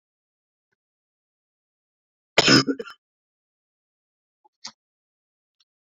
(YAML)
cough_length: 5.8 s
cough_amplitude: 30626
cough_signal_mean_std_ratio: 0.18
survey_phase: beta (2021-08-13 to 2022-03-07)
age: 18-44
gender: Male
wearing_mask: 'No'
symptom_none: true
smoker_status: Current smoker (e-cigarettes or vapes only)
respiratory_condition_asthma: false
respiratory_condition_other: false
recruitment_source: REACT
submission_delay: 4 days
covid_test_result: Negative
covid_test_method: RT-qPCR